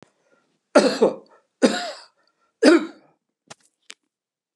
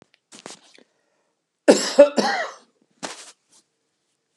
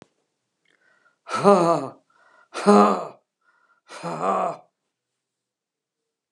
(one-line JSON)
{"three_cough_length": "4.6 s", "three_cough_amplitude": 31483, "three_cough_signal_mean_std_ratio": 0.31, "cough_length": "4.4 s", "cough_amplitude": 32767, "cough_signal_mean_std_ratio": 0.26, "exhalation_length": "6.3 s", "exhalation_amplitude": 29505, "exhalation_signal_mean_std_ratio": 0.33, "survey_phase": "alpha (2021-03-01 to 2021-08-12)", "age": "65+", "gender": "Male", "wearing_mask": "No", "symptom_none": true, "smoker_status": "Never smoked", "respiratory_condition_asthma": false, "respiratory_condition_other": false, "recruitment_source": "REACT", "submission_delay": "1 day", "covid_test_result": "Negative", "covid_test_method": "RT-qPCR"}